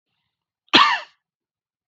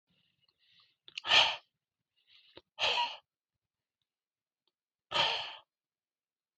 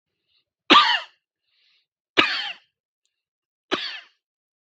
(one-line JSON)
{"cough_length": "1.9 s", "cough_amplitude": 32768, "cough_signal_mean_std_ratio": 0.28, "exhalation_length": "6.6 s", "exhalation_amplitude": 10307, "exhalation_signal_mean_std_ratio": 0.29, "three_cough_length": "4.8 s", "three_cough_amplitude": 32768, "three_cough_signal_mean_std_ratio": 0.27, "survey_phase": "beta (2021-08-13 to 2022-03-07)", "age": "18-44", "gender": "Male", "wearing_mask": "No", "symptom_none": true, "smoker_status": "Ex-smoker", "respiratory_condition_asthma": false, "respiratory_condition_other": false, "recruitment_source": "REACT", "submission_delay": "1 day", "covid_test_result": "Negative", "covid_test_method": "RT-qPCR", "influenza_a_test_result": "Negative", "influenza_b_test_result": "Negative"}